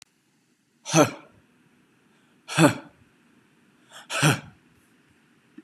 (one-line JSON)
{"exhalation_length": "5.6 s", "exhalation_amplitude": 27565, "exhalation_signal_mean_std_ratio": 0.26, "survey_phase": "beta (2021-08-13 to 2022-03-07)", "age": "18-44", "gender": "Male", "wearing_mask": "No", "symptom_none": true, "symptom_onset": "12 days", "smoker_status": "Never smoked", "respiratory_condition_asthma": false, "respiratory_condition_other": false, "recruitment_source": "REACT", "submission_delay": "1 day", "covid_test_result": "Negative", "covid_test_method": "RT-qPCR", "influenza_a_test_result": "Negative", "influenza_b_test_result": "Negative"}